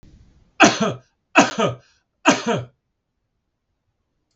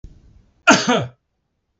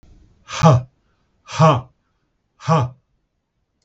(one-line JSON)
{"three_cough_length": "4.4 s", "three_cough_amplitude": 32768, "three_cough_signal_mean_std_ratio": 0.33, "cough_length": "1.8 s", "cough_amplitude": 32768, "cough_signal_mean_std_ratio": 0.34, "exhalation_length": "3.8 s", "exhalation_amplitude": 32704, "exhalation_signal_mean_std_ratio": 0.35, "survey_phase": "beta (2021-08-13 to 2022-03-07)", "age": "45-64", "gender": "Male", "wearing_mask": "No", "symptom_none": true, "smoker_status": "Ex-smoker", "respiratory_condition_asthma": false, "respiratory_condition_other": false, "recruitment_source": "REACT", "submission_delay": "1 day", "covid_test_result": "Negative", "covid_test_method": "RT-qPCR", "influenza_a_test_result": "Negative", "influenza_b_test_result": "Negative"}